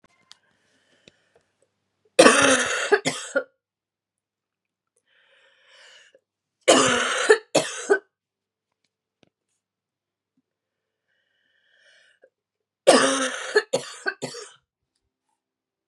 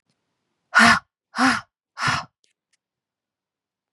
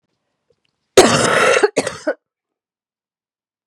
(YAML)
three_cough_length: 15.9 s
three_cough_amplitude: 32767
three_cough_signal_mean_std_ratio: 0.3
exhalation_length: 3.9 s
exhalation_amplitude: 27945
exhalation_signal_mean_std_ratio: 0.31
cough_length: 3.7 s
cough_amplitude: 32768
cough_signal_mean_std_ratio: 0.37
survey_phase: beta (2021-08-13 to 2022-03-07)
age: 18-44
gender: Female
wearing_mask: 'No'
symptom_cough_any: true
symptom_new_continuous_cough: true
symptom_runny_or_blocked_nose: true
symptom_shortness_of_breath: true
symptom_sore_throat: true
symptom_fatigue: true
symptom_headache: true
symptom_onset: 4 days
smoker_status: Never smoked
respiratory_condition_asthma: false
respiratory_condition_other: false
recruitment_source: Test and Trace
submission_delay: 2 days
covid_test_result: Positive
covid_test_method: RT-qPCR
covid_ct_value: 16.4
covid_ct_gene: ORF1ab gene
covid_ct_mean: 16.8
covid_viral_load: 3100000 copies/ml
covid_viral_load_category: High viral load (>1M copies/ml)